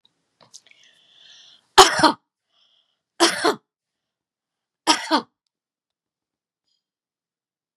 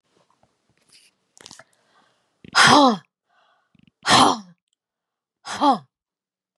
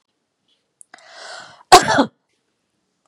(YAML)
three_cough_length: 7.8 s
three_cough_amplitude: 32768
three_cough_signal_mean_std_ratio: 0.22
exhalation_length: 6.6 s
exhalation_amplitude: 29170
exhalation_signal_mean_std_ratio: 0.3
cough_length: 3.1 s
cough_amplitude: 32768
cough_signal_mean_std_ratio: 0.23
survey_phase: beta (2021-08-13 to 2022-03-07)
age: 65+
gender: Female
wearing_mask: 'No'
symptom_none: true
smoker_status: Never smoked
respiratory_condition_asthma: false
respiratory_condition_other: false
recruitment_source: REACT
submission_delay: 1 day
covid_test_result: Negative
covid_test_method: RT-qPCR
influenza_a_test_result: Negative
influenza_b_test_result: Negative